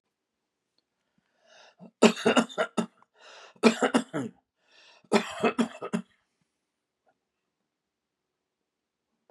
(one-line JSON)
{"three_cough_length": "9.3 s", "three_cough_amplitude": 23469, "three_cough_signal_mean_std_ratio": 0.27, "survey_phase": "beta (2021-08-13 to 2022-03-07)", "age": "65+", "gender": "Male", "wearing_mask": "No", "symptom_none": true, "smoker_status": "Never smoked", "respiratory_condition_asthma": false, "respiratory_condition_other": false, "recruitment_source": "REACT", "submission_delay": "2 days", "covid_test_result": "Negative", "covid_test_method": "RT-qPCR", "influenza_a_test_result": "Negative", "influenza_b_test_result": "Negative"}